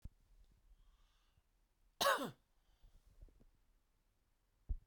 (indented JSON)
{
  "cough_length": "4.9 s",
  "cough_amplitude": 3269,
  "cough_signal_mean_std_ratio": 0.25,
  "survey_phase": "beta (2021-08-13 to 2022-03-07)",
  "age": "45-64",
  "gender": "Male",
  "wearing_mask": "No",
  "symptom_fatigue": true,
  "symptom_onset": "12 days",
  "smoker_status": "Never smoked",
  "respiratory_condition_asthma": false,
  "respiratory_condition_other": false,
  "recruitment_source": "REACT",
  "submission_delay": "1 day",
  "covid_test_result": "Negative",
  "covid_test_method": "RT-qPCR"
}